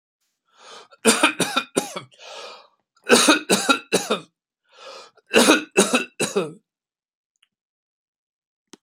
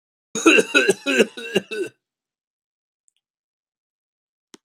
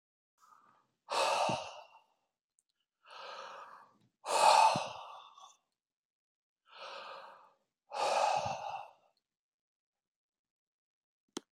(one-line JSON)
{"three_cough_length": "8.8 s", "three_cough_amplitude": 30350, "three_cough_signal_mean_std_ratio": 0.37, "cough_length": "4.6 s", "cough_amplitude": 28315, "cough_signal_mean_std_ratio": 0.32, "exhalation_length": "11.5 s", "exhalation_amplitude": 7939, "exhalation_signal_mean_std_ratio": 0.34, "survey_phase": "beta (2021-08-13 to 2022-03-07)", "age": "65+", "gender": "Male", "wearing_mask": "No", "symptom_none": true, "smoker_status": "Ex-smoker", "respiratory_condition_asthma": false, "respiratory_condition_other": false, "recruitment_source": "REACT", "submission_delay": "2 days", "covid_test_result": "Negative", "covid_test_method": "RT-qPCR"}